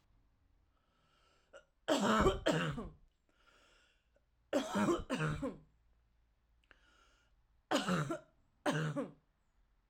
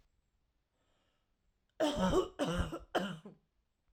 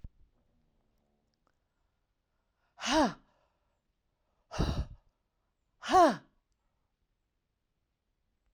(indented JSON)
{
  "three_cough_length": "9.9 s",
  "three_cough_amplitude": 4393,
  "three_cough_signal_mean_std_ratio": 0.43,
  "cough_length": "3.9 s",
  "cough_amplitude": 3356,
  "cough_signal_mean_std_ratio": 0.43,
  "exhalation_length": "8.5 s",
  "exhalation_amplitude": 7894,
  "exhalation_signal_mean_std_ratio": 0.24,
  "survey_phase": "alpha (2021-03-01 to 2021-08-12)",
  "age": "18-44",
  "gender": "Female",
  "wearing_mask": "No",
  "symptom_none": true,
  "smoker_status": "Ex-smoker",
  "respiratory_condition_asthma": false,
  "respiratory_condition_other": false,
  "recruitment_source": "REACT",
  "submission_delay": "1 day",
  "covid_test_result": "Negative",
  "covid_test_method": "RT-qPCR"
}